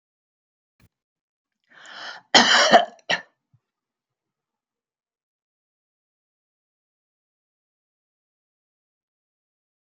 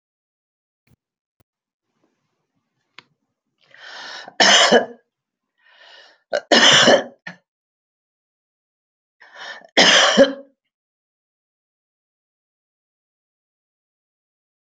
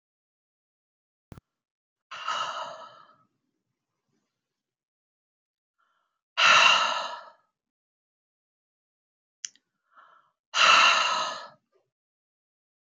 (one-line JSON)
{"cough_length": "9.8 s", "cough_amplitude": 32768, "cough_signal_mean_std_ratio": 0.19, "three_cough_length": "14.8 s", "three_cough_amplitude": 32767, "three_cough_signal_mean_std_ratio": 0.27, "exhalation_length": "13.0 s", "exhalation_amplitude": 17652, "exhalation_signal_mean_std_ratio": 0.28, "survey_phase": "beta (2021-08-13 to 2022-03-07)", "age": "65+", "gender": "Female", "wearing_mask": "No", "symptom_cough_any": true, "symptom_runny_or_blocked_nose": true, "symptom_sore_throat": true, "symptom_fatigue": true, "symptom_headache": true, "symptom_onset": "12 days", "smoker_status": "Never smoked", "respiratory_condition_asthma": false, "respiratory_condition_other": true, "recruitment_source": "REACT", "submission_delay": "1 day", "covid_test_result": "Negative", "covid_test_method": "RT-qPCR"}